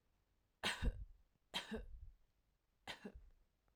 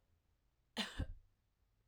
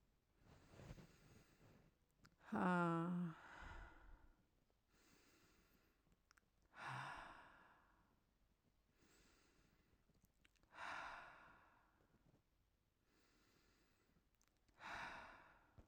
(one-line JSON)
{"three_cough_length": "3.8 s", "three_cough_amplitude": 1302, "three_cough_signal_mean_std_ratio": 0.39, "cough_length": "1.9 s", "cough_amplitude": 1505, "cough_signal_mean_std_ratio": 0.34, "exhalation_length": "15.9 s", "exhalation_amplitude": 889, "exhalation_signal_mean_std_ratio": 0.34, "survey_phase": "alpha (2021-03-01 to 2021-08-12)", "age": "45-64", "gender": "Female", "wearing_mask": "No", "symptom_abdominal_pain": true, "symptom_onset": "13 days", "smoker_status": "Never smoked", "respiratory_condition_asthma": false, "respiratory_condition_other": false, "recruitment_source": "REACT", "submission_delay": "33 days", "covid_test_result": "Negative", "covid_test_method": "RT-qPCR"}